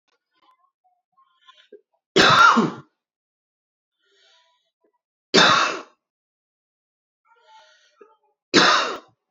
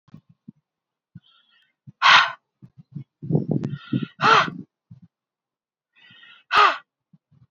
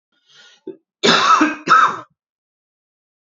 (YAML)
three_cough_length: 9.3 s
three_cough_amplitude: 29472
three_cough_signal_mean_std_ratio: 0.31
exhalation_length: 7.5 s
exhalation_amplitude: 27583
exhalation_signal_mean_std_ratio: 0.32
cough_length: 3.2 s
cough_amplitude: 29151
cough_signal_mean_std_ratio: 0.41
survey_phase: alpha (2021-03-01 to 2021-08-12)
age: 18-44
gender: Male
wearing_mask: 'No'
symptom_cough_any: true
symptom_onset: 4 days
smoker_status: Ex-smoker
respiratory_condition_asthma: false
respiratory_condition_other: false
recruitment_source: Test and Trace
submission_delay: 1 day
covid_test_result: Positive
covid_test_method: RT-qPCR
covid_ct_value: 36.9
covid_ct_gene: N gene